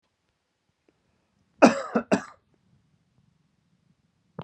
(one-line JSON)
{"cough_length": "4.4 s", "cough_amplitude": 27873, "cough_signal_mean_std_ratio": 0.19, "survey_phase": "beta (2021-08-13 to 2022-03-07)", "age": "18-44", "gender": "Male", "wearing_mask": "No", "symptom_headache": true, "symptom_onset": "4 days", "smoker_status": "Never smoked", "respiratory_condition_asthma": false, "respiratory_condition_other": false, "recruitment_source": "REACT", "submission_delay": "4 days", "covid_test_result": "Negative", "covid_test_method": "RT-qPCR", "influenza_a_test_result": "Negative", "influenza_b_test_result": "Negative"}